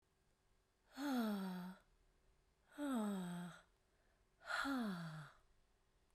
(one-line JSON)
{"exhalation_length": "6.1 s", "exhalation_amplitude": 1043, "exhalation_signal_mean_std_ratio": 0.6, "survey_phase": "beta (2021-08-13 to 2022-03-07)", "age": "18-44", "gender": "Female", "wearing_mask": "No", "symptom_fatigue": true, "symptom_headache": true, "symptom_change_to_sense_of_smell_or_taste": true, "symptom_loss_of_taste": true, "symptom_other": true, "symptom_onset": "8 days", "smoker_status": "Never smoked", "respiratory_condition_asthma": false, "respiratory_condition_other": false, "recruitment_source": "Test and Trace", "submission_delay": "1 day", "covid_test_result": "Positive", "covid_test_method": "RT-qPCR", "covid_ct_value": 23.5, "covid_ct_gene": "ORF1ab gene"}